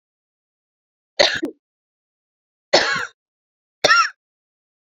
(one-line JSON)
{"three_cough_length": "4.9 s", "three_cough_amplitude": 32768, "three_cough_signal_mean_std_ratio": 0.29, "survey_phase": "beta (2021-08-13 to 2022-03-07)", "age": "18-44", "gender": "Female", "wearing_mask": "No", "symptom_new_continuous_cough": true, "symptom_runny_or_blocked_nose": true, "symptom_sore_throat": true, "symptom_fatigue": true, "symptom_fever_high_temperature": true, "symptom_headache": true, "smoker_status": "Never smoked", "respiratory_condition_asthma": false, "respiratory_condition_other": false, "recruitment_source": "Test and Trace", "submission_delay": "2 days", "covid_test_result": "Positive", "covid_test_method": "RT-qPCR", "covid_ct_value": 15.3, "covid_ct_gene": "ORF1ab gene", "covid_ct_mean": 15.6, "covid_viral_load": "7800000 copies/ml", "covid_viral_load_category": "High viral load (>1M copies/ml)"}